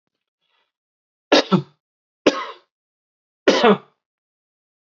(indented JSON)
{
  "three_cough_length": "4.9 s",
  "three_cough_amplitude": 32767,
  "three_cough_signal_mean_std_ratio": 0.27,
  "survey_phase": "beta (2021-08-13 to 2022-03-07)",
  "age": "45-64",
  "gender": "Male",
  "wearing_mask": "No",
  "symptom_cough_any": true,
  "smoker_status": "Ex-smoker",
  "respiratory_condition_asthma": false,
  "respiratory_condition_other": false,
  "recruitment_source": "REACT",
  "submission_delay": "1 day",
  "covid_test_result": "Negative",
  "covid_test_method": "RT-qPCR"
}